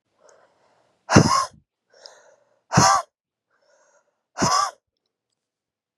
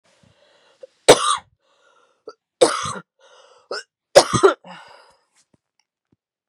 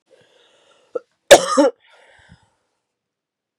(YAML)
exhalation_length: 6.0 s
exhalation_amplitude: 32767
exhalation_signal_mean_std_ratio: 0.3
three_cough_length: 6.5 s
three_cough_amplitude: 32768
three_cough_signal_mean_std_ratio: 0.25
cough_length: 3.6 s
cough_amplitude: 32768
cough_signal_mean_std_ratio: 0.22
survey_phase: beta (2021-08-13 to 2022-03-07)
age: 18-44
gender: Female
wearing_mask: 'No'
symptom_cough_any: true
symptom_new_continuous_cough: true
symptom_runny_or_blocked_nose: true
symptom_sore_throat: true
symptom_fatigue: true
symptom_headache: true
symptom_change_to_sense_of_smell_or_taste: true
symptom_other: true
symptom_onset: 3 days
smoker_status: Never smoked
respiratory_condition_asthma: false
respiratory_condition_other: false
recruitment_source: Test and Trace
submission_delay: 2 days
covid_test_result: Positive
covid_test_method: RT-qPCR
covid_ct_value: 17.0
covid_ct_gene: ORF1ab gene
covid_ct_mean: 17.2
covid_viral_load: 2300000 copies/ml
covid_viral_load_category: High viral load (>1M copies/ml)